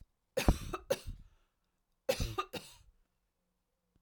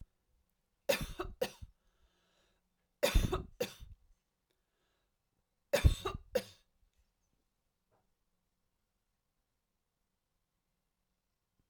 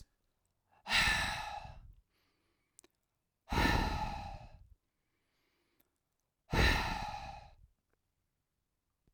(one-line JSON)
{"cough_length": "4.0 s", "cough_amplitude": 9338, "cough_signal_mean_std_ratio": 0.3, "three_cough_length": "11.7 s", "three_cough_amplitude": 6991, "three_cough_signal_mean_std_ratio": 0.22, "exhalation_length": "9.1 s", "exhalation_amplitude": 5003, "exhalation_signal_mean_std_ratio": 0.39, "survey_phase": "alpha (2021-03-01 to 2021-08-12)", "age": "45-64", "gender": "Female", "wearing_mask": "No", "symptom_none": true, "smoker_status": "Never smoked", "respiratory_condition_asthma": false, "respiratory_condition_other": false, "recruitment_source": "REACT", "submission_delay": "2 days", "covid_test_result": "Negative", "covid_test_method": "RT-qPCR"}